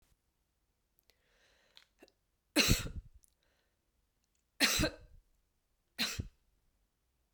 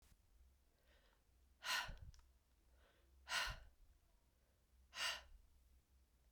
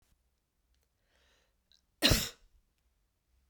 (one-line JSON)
{"three_cough_length": "7.3 s", "three_cough_amplitude": 7230, "three_cough_signal_mean_std_ratio": 0.26, "exhalation_length": "6.3 s", "exhalation_amplitude": 1136, "exhalation_signal_mean_std_ratio": 0.37, "cough_length": "3.5 s", "cough_amplitude": 9556, "cough_signal_mean_std_ratio": 0.2, "survey_phase": "beta (2021-08-13 to 2022-03-07)", "age": "18-44", "gender": "Female", "wearing_mask": "No", "symptom_runny_or_blocked_nose": true, "smoker_status": "Never smoked", "respiratory_condition_asthma": false, "respiratory_condition_other": false, "recruitment_source": "Test and Trace", "submission_delay": "1 day", "covid_test_result": "Positive", "covid_test_method": "RT-qPCR", "covid_ct_value": 29.9, "covid_ct_gene": "ORF1ab gene"}